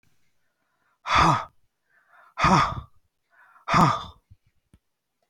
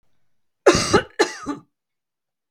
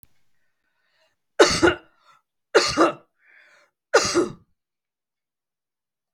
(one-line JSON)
{"exhalation_length": "5.3 s", "exhalation_amplitude": 18919, "exhalation_signal_mean_std_ratio": 0.36, "cough_length": "2.5 s", "cough_amplitude": 32768, "cough_signal_mean_std_ratio": 0.33, "three_cough_length": "6.1 s", "three_cough_amplitude": 32767, "three_cough_signal_mean_std_ratio": 0.3, "survey_phase": "beta (2021-08-13 to 2022-03-07)", "age": "65+", "gender": "Female", "wearing_mask": "No", "symptom_none": true, "smoker_status": "Never smoked", "respiratory_condition_asthma": false, "respiratory_condition_other": false, "recruitment_source": "REACT", "submission_delay": "1 day", "covid_test_result": "Negative", "covid_test_method": "RT-qPCR", "influenza_a_test_result": "Negative", "influenza_b_test_result": "Negative"}